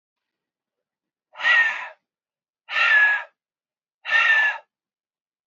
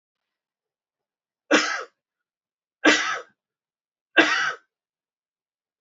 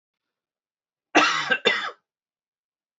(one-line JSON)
{"exhalation_length": "5.5 s", "exhalation_amplitude": 14880, "exhalation_signal_mean_std_ratio": 0.44, "three_cough_length": "5.8 s", "three_cough_amplitude": 27714, "three_cough_signal_mean_std_ratio": 0.29, "cough_length": "3.0 s", "cough_amplitude": 22742, "cough_signal_mean_std_ratio": 0.34, "survey_phase": "beta (2021-08-13 to 2022-03-07)", "age": "45-64", "gender": "Male", "wearing_mask": "No", "symptom_none": true, "smoker_status": "Never smoked", "respiratory_condition_asthma": false, "respiratory_condition_other": false, "recruitment_source": "REACT", "submission_delay": "1 day", "covid_test_result": "Negative", "covid_test_method": "RT-qPCR", "influenza_a_test_result": "Negative", "influenza_b_test_result": "Negative"}